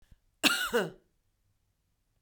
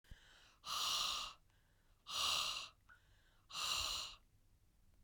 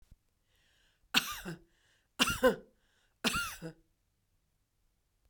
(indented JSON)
{
  "cough_length": "2.2 s",
  "cough_amplitude": 13790,
  "cough_signal_mean_std_ratio": 0.33,
  "exhalation_length": "5.0 s",
  "exhalation_amplitude": 1989,
  "exhalation_signal_mean_std_ratio": 0.55,
  "three_cough_length": "5.3 s",
  "three_cough_amplitude": 12763,
  "three_cough_signal_mean_std_ratio": 0.29,
  "survey_phase": "beta (2021-08-13 to 2022-03-07)",
  "age": "45-64",
  "gender": "Female",
  "wearing_mask": "No",
  "symptom_none": true,
  "smoker_status": "Current smoker (e-cigarettes or vapes only)",
  "respiratory_condition_asthma": false,
  "respiratory_condition_other": false,
  "recruitment_source": "REACT",
  "submission_delay": "2 days",
  "covid_test_result": "Negative",
  "covid_test_method": "RT-qPCR",
  "influenza_a_test_result": "Unknown/Void",
  "influenza_b_test_result": "Unknown/Void"
}